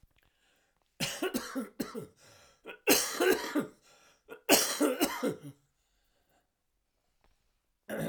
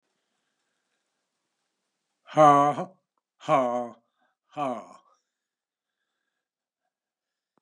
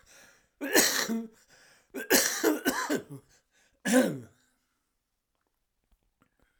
{"three_cough_length": "8.1 s", "three_cough_amplitude": 12570, "three_cough_signal_mean_std_ratio": 0.4, "exhalation_length": "7.6 s", "exhalation_amplitude": 19292, "exhalation_signal_mean_std_ratio": 0.25, "cough_length": "6.6 s", "cough_amplitude": 15767, "cough_signal_mean_std_ratio": 0.4, "survey_phase": "alpha (2021-03-01 to 2021-08-12)", "age": "65+", "gender": "Male", "wearing_mask": "No", "symptom_cough_any": true, "symptom_shortness_of_breath": true, "symptom_diarrhoea": true, "symptom_fatigue": true, "smoker_status": "Never smoked", "respiratory_condition_asthma": false, "respiratory_condition_other": false, "recruitment_source": "Test and Trace", "submission_delay": "2 days", "covid_test_result": "Positive", "covid_test_method": "LFT"}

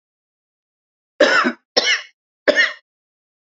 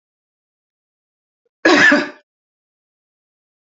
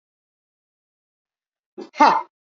{"three_cough_length": "3.6 s", "three_cough_amplitude": 31340, "three_cough_signal_mean_std_ratio": 0.36, "cough_length": "3.8 s", "cough_amplitude": 30319, "cough_signal_mean_std_ratio": 0.27, "exhalation_length": "2.6 s", "exhalation_amplitude": 27369, "exhalation_signal_mean_std_ratio": 0.22, "survey_phase": "beta (2021-08-13 to 2022-03-07)", "age": "65+", "gender": "Female", "wearing_mask": "No", "symptom_none": true, "symptom_onset": "9 days", "smoker_status": "Never smoked", "respiratory_condition_asthma": false, "respiratory_condition_other": false, "recruitment_source": "REACT", "submission_delay": "1 day", "covid_test_result": "Negative", "covid_test_method": "RT-qPCR", "influenza_a_test_result": "Negative", "influenza_b_test_result": "Negative"}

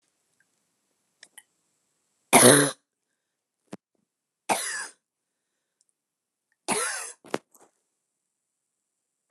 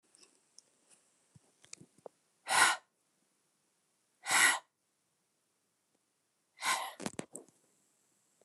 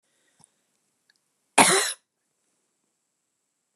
{"three_cough_length": "9.3 s", "three_cough_amplitude": 28928, "three_cough_signal_mean_std_ratio": 0.21, "exhalation_length": "8.4 s", "exhalation_amplitude": 7897, "exhalation_signal_mean_std_ratio": 0.25, "cough_length": "3.8 s", "cough_amplitude": 26800, "cough_signal_mean_std_ratio": 0.22, "survey_phase": "beta (2021-08-13 to 2022-03-07)", "age": "65+", "gender": "Female", "wearing_mask": "No", "symptom_sore_throat": true, "symptom_headache": true, "smoker_status": "Never smoked", "respiratory_condition_asthma": false, "respiratory_condition_other": false, "recruitment_source": "Test and Trace", "submission_delay": "2 days", "covid_test_result": "Positive", "covid_test_method": "RT-qPCR", "covid_ct_value": 20.9, "covid_ct_gene": "N gene"}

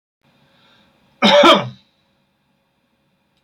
{"cough_length": "3.4 s", "cough_amplitude": 30822, "cough_signal_mean_std_ratio": 0.29, "survey_phase": "beta (2021-08-13 to 2022-03-07)", "age": "65+", "gender": "Male", "wearing_mask": "No", "symptom_none": true, "smoker_status": "Ex-smoker", "respiratory_condition_asthma": false, "respiratory_condition_other": false, "recruitment_source": "REACT", "submission_delay": "9 days", "covid_test_result": "Negative", "covid_test_method": "RT-qPCR", "influenza_a_test_result": "Negative", "influenza_b_test_result": "Negative"}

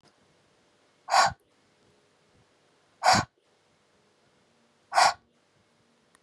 {"exhalation_length": "6.2 s", "exhalation_amplitude": 14200, "exhalation_signal_mean_std_ratio": 0.25, "survey_phase": "beta (2021-08-13 to 2022-03-07)", "age": "18-44", "gender": "Female", "wearing_mask": "No", "symptom_none": true, "smoker_status": "Never smoked", "respiratory_condition_asthma": true, "respiratory_condition_other": false, "recruitment_source": "REACT", "submission_delay": "2 days", "covid_test_result": "Negative", "covid_test_method": "RT-qPCR"}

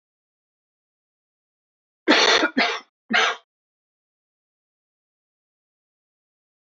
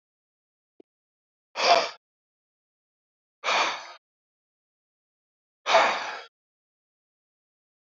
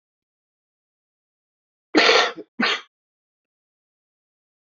{"cough_length": "6.7 s", "cough_amplitude": 24663, "cough_signal_mean_std_ratio": 0.28, "exhalation_length": "7.9 s", "exhalation_amplitude": 19806, "exhalation_signal_mean_std_ratio": 0.27, "three_cough_length": "4.8 s", "three_cough_amplitude": 32717, "three_cough_signal_mean_std_ratio": 0.26, "survey_phase": "beta (2021-08-13 to 2022-03-07)", "age": "45-64", "gender": "Male", "wearing_mask": "No", "symptom_cough_any": true, "symptom_runny_or_blocked_nose": true, "symptom_headache": true, "symptom_change_to_sense_of_smell_or_taste": true, "smoker_status": "Never smoked", "respiratory_condition_asthma": false, "respiratory_condition_other": false, "recruitment_source": "Test and Trace", "submission_delay": "2 days", "covid_test_result": "Positive", "covid_test_method": "LFT"}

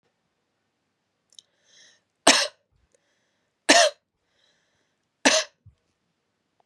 {"three_cough_length": "6.7 s", "three_cough_amplitude": 32406, "three_cough_signal_mean_std_ratio": 0.22, "survey_phase": "beta (2021-08-13 to 2022-03-07)", "age": "18-44", "gender": "Female", "wearing_mask": "No", "symptom_none": true, "smoker_status": "Never smoked", "respiratory_condition_asthma": false, "respiratory_condition_other": false, "recruitment_source": "REACT", "submission_delay": "2 days", "covid_test_result": "Negative", "covid_test_method": "RT-qPCR"}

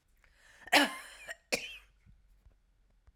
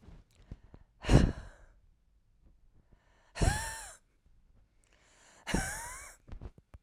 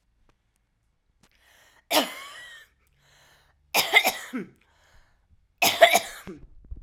{"cough_length": "3.2 s", "cough_amplitude": 9351, "cough_signal_mean_std_ratio": 0.27, "exhalation_length": "6.8 s", "exhalation_amplitude": 12944, "exhalation_signal_mean_std_ratio": 0.29, "three_cough_length": "6.8 s", "three_cough_amplitude": 31925, "three_cough_signal_mean_std_ratio": 0.29, "survey_phase": "alpha (2021-03-01 to 2021-08-12)", "age": "45-64", "gender": "Female", "wearing_mask": "No", "symptom_cough_any": true, "symptom_shortness_of_breath": true, "symptom_fatigue": true, "symptom_headache": true, "symptom_change_to_sense_of_smell_or_taste": true, "symptom_loss_of_taste": true, "symptom_onset": "4 days", "smoker_status": "Never smoked", "respiratory_condition_asthma": false, "respiratory_condition_other": false, "recruitment_source": "Test and Trace", "submission_delay": "1 day", "covid_test_result": "Positive", "covid_test_method": "RT-qPCR"}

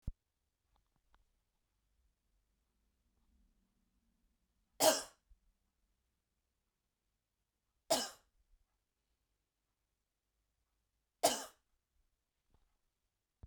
{"three_cough_length": "13.5 s", "three_cough_amplitude": 5944, "three_cough_signal_mean_std_ratio": 0.16, "survey_phase": "beta (2021-08-13 to 2022-03-07)", "age": "18-44", "gender": "Female", "wearing_mask": "No", "symptom_fatigue": true, "smoker_status": "Never smoked", "respiratory_condition_asthma": false, "respiratory_condition_other": false, "recruitment_source": "REACT", "submission_delay": "1 day", "covid_test_result": "Negative", "covid_test_method": "RT-qPCR"}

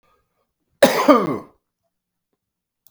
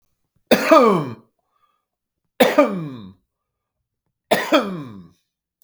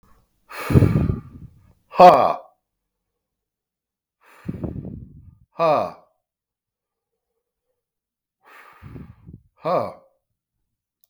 {"cough_length": "2.9 s", "cough_amplitude": 32768, "cough_signal_mean_std_ratio": 0.3, "three_cough_length": "5.6 s", "three_cough_amplitude": 32768, "three_cough_signal_mean_std_ratio": 0.37, "exhalation_length": "11.1 s", "exhalation_amplitude": 32768, "exhalation_signal_mean_std_ratio": 0.26, "survey_phase": "beta (2021-08-13 to 2022-03-07)", "age": "45-64", "gender": "Male", "wearing_mask": "No", "symptom_none": true, "smoker_status": "Never smoked", "respiratory_condition_asthma": false, "respiratory_condition_other": false, "recruitment_source": "REACT", "submission_delay": "2 days", "covid_test_result": "Negative", "covid_test_method": "RT-qPCR", "influenza_a_test_result": "Negative", "influenza_b_test_result": "Negative"}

